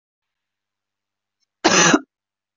{
  "cough_length": "2.6 s",
  "cough_amplitude": 27363,
  "cough_signal_mean_std_ratio": 0.29,
  "survey_phase": "beta (2021-08-13 to 2022-03-07)",
  "age": "45-64",
  "gender": "Female",
  "wearing_mask": "No",
  "symptom_headache": true,
  "symptom_change_to_sense_of_smell_or_taste": true,
  "symptom_loss_of_taste": true,
  "smoker_status": "Ex-smoker",
  "respiratory_condition_asthma": false,
  "respiratory_condition_other": false,
  "recruitment_source": "REACT",
  "submission_delay": "1 day",
  "covid_test_result": "Negative",
  "covid_test_method": "RT-qPCR"
}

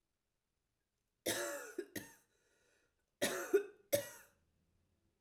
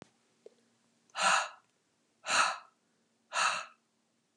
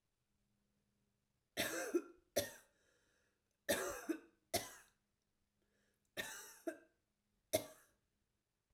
{
  "cough_length": "5.2 s",
  "cough_amplitude": 3309,
  "cough_signal_mean_std_ratio": 0.32,
  "exhalation_length": "4.4 s",
  "exhalation_amplitude": 6979,
  "exhalation_signal_mean_std_ratio": 0.36,
  "three_cough_length": "8.7 s",
  "three_cough_amplitude": 2833,
  "three_cough_signal_mean_std_ratio": 0.31,
  "survey_phase": "alpha (2021-03-01 to 2021-08-12)",
  "age": "45-64",
  "gender": "Female",
  "wearing_mask": "No",
  "symptom_none": true,
  "smoker_status": "Ex-smoker",
  "respiratory_condition_asthma": true,
  "respiratory_condition_other": false,
  "recruitment_source": "REACT",
  "submission_delay": "1 day",
  "covid_test_result": "Negative",
  "covid_test_method": "RT-qPCR"
}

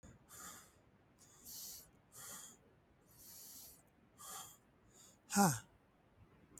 {
  "exhalation_length": "6.6 s",
  "exhalation_amplitude": 3915,
  "exhalation_signal_mean_std_ratio": 0.29,
  "survey_phase": "beta (2021-08-13 to 2022-03-07)",
  "age": "45-64",
  "gender": "Male",
  "wearing_mask": "No",
  "symptom_none": true,
  "smoker_status": "Never smoked",
  "respiratory_condition_asthma": false,
  "respiratory_condition_other": false,
  "recruitment_source": "REACT",
  "submission_delay": "1 day",
  "covid_test_result": "Negative",
  "covid_test_method": "RT-qPCR",
  "influenza_a_test_result": "Negative",
  "influenza_b_test_result": "Negative"
}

